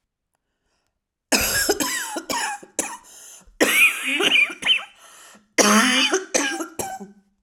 {"cough_length": "7.4 s", "cough_amplitude": 32075, "cough_signal_mean_std_ratio": 0.56, "survey_phase": "beta (2021-08-13 to 2022-03-07)", "age": "45-64", "gender": "Female", "wearing_mask": "No", "symptom_runny_or_blocked_nose": true, "symptom_sore_throat": true, "symptom_diarrhoea": true, "symptom_fatigue": true, "symptom_headache": true, "symptom_onset": "3 days", "smoker_status": "Never smoked", "respiratory_condition_asthma": false, "respiratory_condition_other": false, "recruitment_source": "Test and Trace", "submission_delay": "1 day", "covid_test_result": "Positive", "covid_test_method": "RT-qPCR", "covid_ct_value": 26.8, "covid_ct_gene": "ORF1ab gene"}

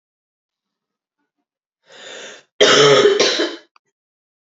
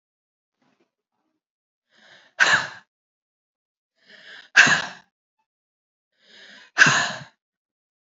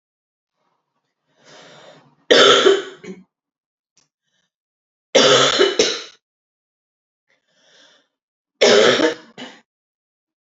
{"cough_length": "4.4 s", "cough_amplitude": 32740, "cough_signal_mean_std_ratio": 0.38, "exhalation_length": "8.0 s", "exhalation_amplitude": 32768, "exhalation_signal_mean_std_ratio": 0.25, "three_cough_length": "10.6 s", "three_cough_amplitude": 32768, "three_cough_signal_mean_std_ratio": 0.34, "survey_phase": "alpha (2021-03-01 to 2021-08-12)", "age": "18-44", "gender": "Female", "wearing_mask": "No", "symptom_cough_any": true, "symptom_new_continuous_cough": true, "symptom_fatigue": true, "symptom_headache": true, "symptom_onset": "3 days", "smoker_status": "Ex-smoker", "respiratory_condition_asthma": false, "respiratory_condition_other": false, "recruitment_source": "Test and Trace", "submission_delay": "2 days", "covid_test_result": "Positive", "covid_test_method": "RT-qPCR", "covid_ct_value": 28.1, "covid_ct_gene": "ORF1ab gene", "covid_ct_mean": 28.5, "covid_viral_load": "440 copies/ml", "covid_viral_load_category": "Minimal viral load (< 10K copies/ml)"}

